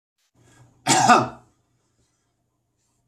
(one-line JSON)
{"cough_length": "3.1 s", "cough_amplitude": 25688, "cough_signal_mean_std_ratio": 0.28, "survey_phase": "beta (2021-08-13 to 2022-03-07)", "age": "45-64", "gender": "Male", "wearing_mask": "No", "symptom_none": true, "smoker_status": "Never smoked", "respiratory_condition_asthma": false, "respiratory_condition_other": false, "recruitment_source": "REACT", "submission_delay": "1 day", "covid_test_result": "Negative", "covid_test_method": "RT-qPCR", "influenza_a_test_result": "Negative", "influenza_b_test_result": "Negative"}